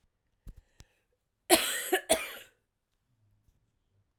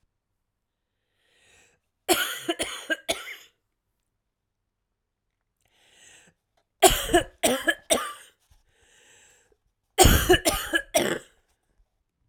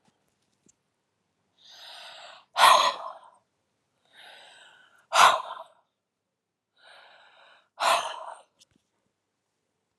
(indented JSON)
{
  "cough_length": "4.2 s",
  "cough_amplitude": 22344,
  "cough_signal_mean_std_ratio": 0.27,
  "three_cough_length": "12.3 s",
  "three_cough_amplitude": 29504,
  "three_cough_signal_mean_std_ratio": 0.31,
  "exhalation_length": "10.0 s",
  "exhalation_amplitude": 22360,
  "exhalation_signal_mean_std_ratio": 0.25,
  "survey_phase": "alpha (2021-03-01 to 2021-08-12)",
  "age": "45-64",
  "gender": "Female",
  "wearing_mask": "No",
  "symptom_cough_any": true,
  "symptom_new_continuous_cough": true,
  "symptom_shortness_of_breath": true,
  "symptom_diarrhoea": true,
  "symptom_fatigue": true,
  "symptom_fever_high_temperature": true,
  "symptom_headache": true,
  "symptom_onset": "3 days",
  "smoker_status": "Ex-smoker",
  "respiratory_condition_asthma": false,
  "respiratory_condition_other": false,
  "recruitment_source": "Test and Trace",
  "submission_delay": "1 day",
  "covid_test_result": "Positive",
  "covid_test_method": "RT-qPCR",
  "covid_ct_value": 22.1,
  "covid_ct_gene": "ORF1ab gene",
  "covid_ct_mean": 22.8,
  "covid_viral_load": "32000 copies/ml",
  "covid_viral_load_category": "Low viral load (10K-1M copies/ml)"
}